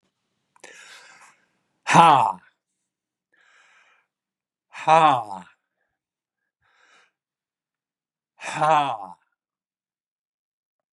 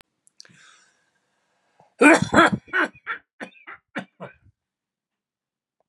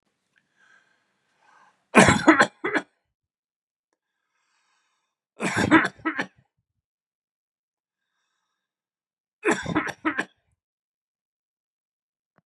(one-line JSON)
{"exhalation_length": "10.9 s", "exhalation_amplitude": 30920, "exhalation_signal_mean_std_ratio": 0.25, "cough_length": "5.9 s", "cough_amplitude": 29199, "cough_signal_mean_std_ratio": 0.26, "three_cough_length": "12.5 s", "three_cough_amplitude": 32767, "three_cough_signal_mean_std_ratio": 0.24, "survey_phase": "beta (2021-08-13 to 2022-03-07)", "age": "65+", "gender": "Male", "wearing_mask": "No", "symptom_none": true, "smoker_status": "Never smoked", "respiratory_condition_asthma": false, "respiratory_condition_other": false, "recruitment_source": "REACT", "submission_delay": "3 days", "covid_test_result": "Negative", "covid_test_method": "RT-qPCR", "influenza_a_test_result": "Negative", "influenza_b_test_result": "Negative"}